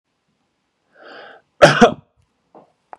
{"cough_length": "3.0 s", "cough_amplitude": 32768, "cough_signal_mean_std_ratio": 0.23, "survey_phase": "beta (2021-08-13 to 2022-03-07)", "age": "65+", "gender": "Male", "wearing_mask": "No", "symptom_none": true, "smoker_status": "Never smoked", "respiratory_condition_asthma": false, "respiratory_condition_other": false, "recruitment_source": "REACT", "submission_delay": "3 days", "covid_test_result": "Negative", "covid_test_method": "RT-qPCR", "influenza_a_test_result": "Negative", "influenza_b_test_result": "Negative"}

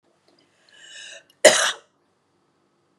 {"cough_length": "3.0 s", "cough_amplitude": 32768, "cough_signal_mean_std_ratio": 0.22, "survey_phase": "beta (2021-08-13 to 2022-03-07)", "age": "45-64", "gender": "Female", "wearing_mask": "No", "symptom_cough_any": true, "symptom_runny_or_blocked_nose": true, "symptom_sore_throat": true, "symptom_fatigue": true, "smoker_status": "Never smoked", "respiratory_condition_asthma": false, "respiratory_condition_other": false, "recruitment_source": "Test and Trace", "submission_delay": "2 days", "covid_test_result": "Positive", "covid_test_method": "RT-qPCR", "covid_ct_value": 28.5, "covid_ct_gene": "ORF1ab gene", "covid_ct_mean": 29.5, "covid_viral_load": "210 copies/ml", "covid_viral_load_category": "Minimal viral load (< 10K copies/ml)"}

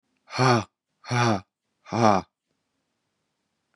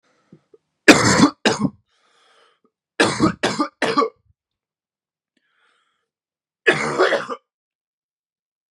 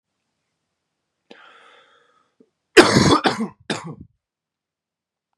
{"exhalation_length": "3.8 s", "exhalation_amplitude": 22281, "exhalation_signal_mean_std_ratio": 0.36, "three_cough_length": "8.7 s", "three_cough_amplitude": 32768, "three_cough_signal_mean_std_ratio": 0.34, "cough_length": "5.4 s", "cough_amplitude": 32768, "cough_signal_mean_std_ratio": 0.26, "survey_phase": "beta (2021-08-13 to 2022-03-07)", "age": "18-44", "gender": "Male", "wearing_mask": "No", "symptom_cough_any": true, "symptom_runny_or_blocked_nose": true, "symptom_sore_throat": true, "symptom_diarrhoea": true, "symptom_fatigue": true, "smoker_status": "Never smoked", "respiratory_condition_asthma": false, "respiratory_condition_other": false, "recruitment_source": "Test and Trace", "submission_delay": "1 day", "covid_test_result": "Positive", "covid_test_method": "LFT"}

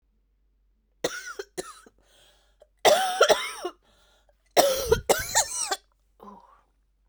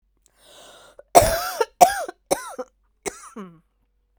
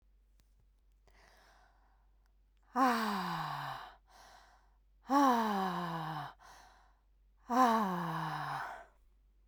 {"three_cough_length": "7.1 s", "three_cough_amplitude": 22823, "three_cough_signal_mean_std_ratio": 0.37, "cough_length": "4.2 s", "cough_amplitude": 32768, "cough_signal_mean_std_ratio": 0.29, "exhalation_length": "9.5 s", "exhalation_amplitude": 5921, "exhalation_signal_mean_std_ratio": 0.48, "survey_phase": "beta (2021-08-13 to 2022-03-07)", "age": "45-64", "gender": "Female", "wearing_mask": "No", "symptom_cough_any": true, "symptom_shortness_of_breath": true, "symptom_fatigue": true, "symptom_headache": true, "symptom_change_to_sense_of_smell_or_taste": true, "symptom_loss_of_taste": true, "symptom_onset": "7 days", "smoker_status": "Ex-smoker", "respiratory_condition_asthma": true, "respiratory_condition_other": false, "recruitment_source": "Test and Trace", "submission_delay": "2 days", "covid_test_result": "Positive", "covid_test_method": "RT-qPCR", "covid_ct_value": 21.3, "covid_ct_gene": "N gene"}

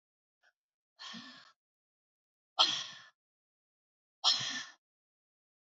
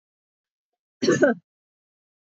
{"exhalation_length": "5.6 s", "exhalation_amplitude": 8306, "exhalation_signal_mean_std_ratio": 0.26, "cough_length": "2.3 s", "cough_amplitude": 21122, "cough_signal_mean_std_ratio": 0.29, "survey_phase": "beta (2021-08-13 to 2022-03-07)", "age": "65+", "gender": "Female", "wearing_mask": "No", "symptom_runny_or_blocked_nose": true, "symptom_sore_throat": true, "symptom_onset": "2 days", "smoker_status": "Never smoked", "respiratory_condition_asthma": false, "respiratory_condition_other": false, "recruitment_source": "Test and Trace", "submission_delay": "2 days", "covid_test_result": "Positive", "covid_test_method": "RT-qPCR", "covid_ct_value": 31.3, "covid_ct_gene": "N gene"}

